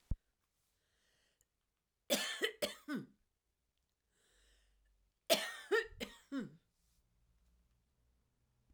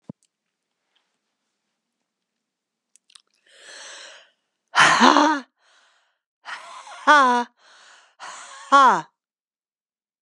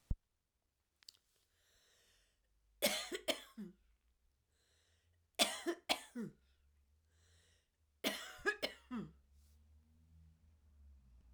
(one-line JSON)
{"cough_length": "8.7 s", "cough_amplitude": 5183, "cough_signal_mean_std_ratio": 0.28, "exhalation_length": "10.2 s", "exhalation_amplitude": 32768, "exhalation_signal_mean_std_ratio": 0.3, "three_cough_length": "11.3 s", "three_cough_amplitude": 5769, "three_cough_signal_mean_std_ratio": 0.3, "survey_phase": "alpha (2021-03-01 to 2021-08-12)", "age": "65+", "gender": "Female", "wearing_mask": "No", "symptom_diarrhoea": true, "symptom_fatigue": true, "symptom_headache": true, "smoker_status": "Never smoked", "respiratory_condition_asthma": true, "respiratory_condition_other": false, "recruitment_source": "Test and Trace", "submission_delay": "2 days", "covid_test_result": "Positive", "covid_test_method": "RT-qPCR", "covid_ct_value": 17.1, "covid_ct_gene": "S gene", "covid_ct_mean": 17.6, "covid_viral_load": "1600000 copies/ml", "covid_viral_load_category": "High viral load (>1M copies/ml)"}